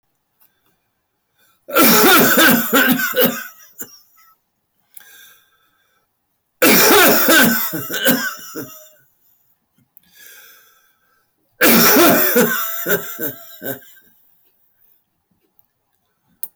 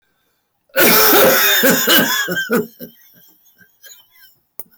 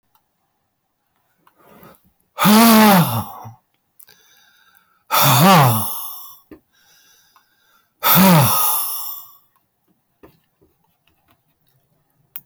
{
  "three_cough_length": "16.6 s",
  "three_cough_amplitude": 26554,
  "three_cough_signal_mean_std_ratio": 0.48,
  "cough_length": "4.8 s",
  "cough_amplitude": 25604,
  "cough_signal_mean_std_ratio": 0.59,
  "exhalation_length": "12.5 s",
  "exhalation_amplitude": 27545,
  "exhalation_signal_mean_std_ratio": 0.4,
  "survey_phase": "beta (2021-08-13 to 2022-03-07)",
  "age": "65+",
  "gender": "Male",
  "wearing_mask": "No",
  "symptom_cough_any": true,
  "symptom_runny_or_blocked_nose": true,
  "symptom_sore_throat": true,
  "symptom_headache": true,
  "symptom_onset": "5 days",
  "smoker_status": "Never smoked",
  "respiratory_condition_asthma": false,
  "respiratory_condition_other": false,
  "recruitment_source": "Test and Trace",
  "submission_delay": "2 days",
  "covid_test_result": "Positive",
  "covid_test_method": "RT-qPCR",
  "covid_ct_value": 15.8,
  "covid_ct_gene": "ORF1ab gene"
}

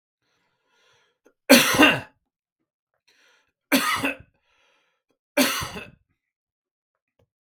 {
  "three_cough_length": "7.4 s",
  "three_cough_amplitude": 32766,
  "three_cough_signal_mean_std_ratio": 0.28,
  "survey_phase": "beta (2021-08-13 to 2022-03-07)",
  "age": "45-64",
  "gender": "Male",
  "wearing_mask": "No",
  "symptom_headache": true,
  "symptom_other": true,
  "symptom_onset": "6 days",
  "smoker_status": "Ex-smoker",
  "respiratory_condition_asthma": false,
  "respiratory_condition_other": false,
  "recruitment_source": "REACT",
  "submission_delay": "2 days",
  "covid_test_result": "Negative",
  "covid_test_method": "RT-qPCR",
  "influenza_a_test_result": "Negative",
  "influenza_b_test_result": "Negative"
}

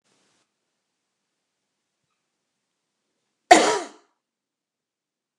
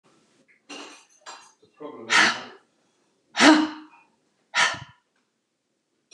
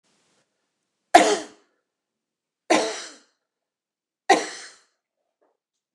{
  "cough_length": "5.4 s",
  "cough_amplitude": 29204,
  "cough_signal_mean_std_ratio": 0.16,
  "exhalation_length": "6.1 s",
  "exhalation_amplitude": 28431,
  "exhalation_signal_mean_std_ratio": 0.3,
  "three_cough_length": "5.9 s",
  "three_cough_amplitude": 29204,
  "three_cough_signal_mean_std_ratio": 0.23,
  "survey_phase": "beta (2021-08-13 to 2022-03-07)",
  "age": "65+",
  "gender": "Female",
  "wearing_mask": "No",
  "symptom_cough_any": true,
  "symptom_runny_or_blocked_nose": true,
  "symptom_fatigue": true,
  "symptom_onset": "5 days",
  "smoker_status": "Never smoked",
  "respiratory_condition_asthma": false,
  "respiratory_condition_other": false,
  "recruitment_source": "Test and Trace",
  "submission_delay": "2 days",
  "covid_test_result": "Positive",
  "covid_test_method": "RT-qPCR",
  "covid_ct_value": 21.8,
  "covid_ct_gene": "N gene"
}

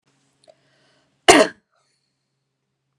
{
  "cough_length": "3.0 s",
  "cough_amplitude": 32768,
  "cough_signal_mean_std_ratio": 0.19,
  "survey_phase": "beta (2021-08-13 to 2022-03-07)",
  "age": "18-44",
  "gender": "Female",
  "wearing_mask": "No",
  "symptom_none": true,
  "smoker_status": "Never smoked",
  "respiratory_condition_asthma": false,
  "respiratory_condition_other": false,
  "recruitment_source": "REACT",
  "submission_delay": "2 days",
  "covid_test_result": "Negative",
  "covid_test_method": "RT-qPCR",
  "influenza_a_test_result": "Negative",
  "influenza_b_test_result": "Negative"
}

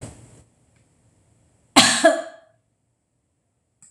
{
  "cough_length": "3.9 s",
  "cough_amplitude": 26028,
  "cough_signal_mean_std_ratio": 0.26,
  "survey_phase": "beta (2021-08-13 to 2022-03-07)",
  "age": "45-64",
  "gender": "Female",
  "wearing_mask": "No",
  "symptom_none": true,
  "smoker_status": "Ex-smoker",
  "respiratory_condition_asthma": false,
  "respiratory_condition_other": false,
  "recruitment_source": "REACT",
  "submission_delay": "2 days",
  "covid_test_result": "Negative",
  "covid_test_method": "RT-qPCR",
  "influenza_a_test_result": "Negative",
  "influenza_b_test_result": "Negative"
}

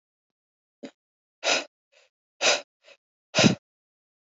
{
  "exhalation_length": "4.3 s",
  "exhalation_amplitude": 19236,
  "exhalation_signal_mean_std_ratio": 0.27,
  "survey_phase": "beta (2021-08-13 to 2022-03-07)",
  "age": "18-44",
  "gender": "Female",
  "wearing_mask": "No",
  "symptom_none": true,
  "smoker_status": "Never smoked",
  "respiratory_condition_asthma": false,
  "respiratory_condition_other": false,
  "recruitment_source": "REACT",
  "submission_delay": "3 days",
  "covid_test_result": "Negative",
  "covid_test_method": "RT-qPCR",
  "influenza_a_test_result": "Negative",
  "influenza_b_test_result": "Negative"
}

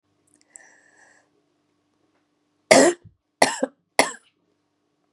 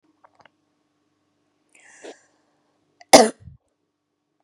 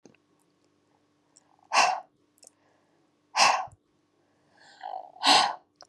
{
  "three_cough_length": "5.1 s",
  "three_cough_amplitude": 32768,
  "three_cough_signal_mean_std_ratio": 0.22,
  "cough_length": "4.4 s",
  "cough_amplitude": 32768,
  "cough_signal_mean_std_ratio": 0.14,
  "exhalation_length": "5.9 s",
  "exhalation_amplitude": 17561,
  "exhalation_signal_mean_std_ratio": 0.31,
  "survey_phase": "beta (2021-08-13 to 2022-03-07)",
  "age": "18-44",
  "gender": "Female",
  "wearing_mask": "No",
  "symptom_none": true,
  "smoker_status": "Never smoked",
  "respiratory_condition_asthma": true,
  "respiratory_condition_other": false,
  "recruitment_source": "REACT",
  "submission_delay": "2 days",
  "covid_test_result": "Negative",
  "covid_test_method": "RT-qPCR",
  "influenza_a_test_result": "Negative",
  "influenza_b_test_result": "Negative"
}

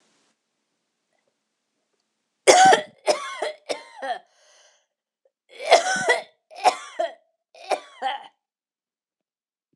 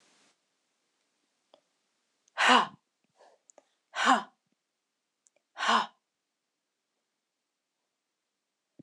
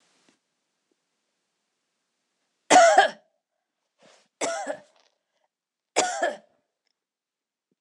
{
  "cough_length": "9.8 s",
  "cough_amplitude": 26028,
  "cough_signal_mean_std_ratio": 0.3,
  "exhalation_length": "8.8 s",
  "exhalation_amplitude": 12935,
  "exhalation_signal_mean_std_ratio": 0.23,
  "three_cough_length": "7.8 s",
  "three_cough_amplitude": 21479,
  "three_cough_signal_mean_std_ratio": 0.25,
  "survey_phase": "alpha (2021-03-01 to 2021-08-12)",
  "age": "45-64",
  "gender": "Female",
  "wearing_mask": "No",
  "symptom_none": true,
  "smoker_status": "Never smoked",
  "respiratory_condition_asthma": false,
  "respiratory_condition_other": false,
  "recruitment_source": "REACT",
  "submission_delay": "2 days",
  "covid_test_result": "Negative",
  "covid_test_method": "RT-qPCR"
}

